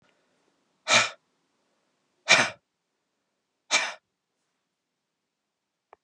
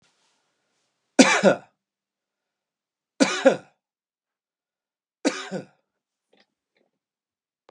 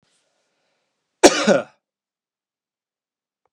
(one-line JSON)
{"exhalation_length": "6.0 s", "exhalation_amplitude": 20076, "exhalation_signal_mean_std_ratio": 0.23, "three_cough_length": "7.7 s", "three_cough_amplitude": 31191, "three_cough_signal_mean_std_ratio": 0.22, "cough_length": "3.5 s", "cough_amplitude": 32768, "cough_signal_mean_std_ratio": 0.21, "survey_phase": "beta (2021-08-13 to 2022-03-07)", "age": "45-64", "gender": "Male", "wearing_mask": "No", "symptom_runny_or_blocked_nose": true, "symptom_sore_throat": true, "symptom_change_to_sense_of_smell_or_taste": true, "smoker_status": "Never smoked", "respiratory_condition_asthma": false, "respiratory_condition_other": false, "recruitment_source": "Test and Trace", "submission_delay": "16 days", "covid_test_result": "Negative", "covid_test_method": "RT-qPCR"}